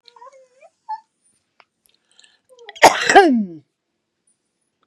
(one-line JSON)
{"cough_length": "4.9 s", "cough_amplitude": 32768, "cough_signal_mean_std_ratio": 0.26, "survey_phase": "beta (2021-08-13 to 2022-03-07)", "age": "65+", "gender": "Female", "wearing_mask": "No", "symptom_cough_any": true, "smoker_status": "Ex-smoker", "respiratory_condition_asthma": false, "respiratory_condition_other": true, "recruitment_source": "REACT", "submission_delay": "2 days", "covid_test_result": "Negative", "covid_test_method": "RT-qPCR", "influenza_a_test_result": "Negative", "influenza_b_test_result": "Negative"}